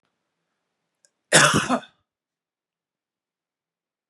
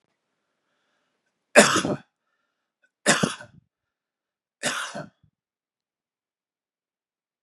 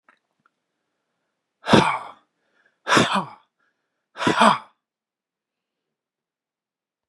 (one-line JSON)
{"cough_length": "4.1 s", "cough_amplitude": 31097, "cough_signal_mean_std_ratio": 0.24, "three_cough_length": "7.4 s", "three_cough_amplitude": 32768, "three_cough_signal_mean_std_ratio": 0.22, "exhalation_length": "7.1 s", "exhalation_amplitude": 32768, "exhalation_signal_mean_std_ratio": 0.28, "survey_phase": "beta (2021-08-13 to 2022-03-07)", "age": "45-64", "gender": "Male", "wearing_mask": "No", "symptom_none": true, "smoker_status": "Never smoked", "respiratory_condition_asthma": false, "respiratory_condition_other": false, "recruitment_source": "REACT", "submission_delay": "1 day", "covid_test_result": "Negative", "covid_test_method": "RT-qPCR", "influenza_a_test_result": "Negative", "influenza_b_test_result": "Negative"}